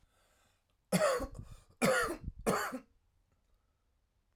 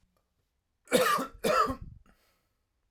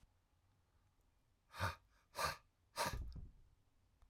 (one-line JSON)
{"three_cough_length": "4.4 s", "three_cough_amplitude": 4590, "three_cough_signal_mean_std_ratio": 0.42, "cough_length": "2.9 s", "cough_amplitude": 9925, "cough_signal_mean_std_ratio": 0.41, "exhalation_length": "4.1 s", "exhalation_amplitude": 1584, "exhalation_signal_mean_std_ratio": 0.39, "survey_phase": "alpha (2021-03-01 to 2021-08-12)", "age": "18-44", "gender": "Male", "wearing_mask": "No", "symptom_cough_any": true, "symptom_shortness_of_breath": true, "symptom_fatigue": true, "symptom_onset": "3 days", "smoker_status": "Ex-smoker", "respiratory_condition_asthma": false, "respiratory_condition_other": false, "recruitment_source": "Test and Trace", "submission_delay": "2 days", "covid_test_result": "Positive", "covid_test_method": "RT-qPCR", "covid_ct_value": 22.3, "covid_ct_gene": "S gene", "covid_ct_mean": 22.5, "covid_viral_load": "42000 copies/ml", "covid_viral_load_category": "Low viral load (10K-1M copies/ml)"}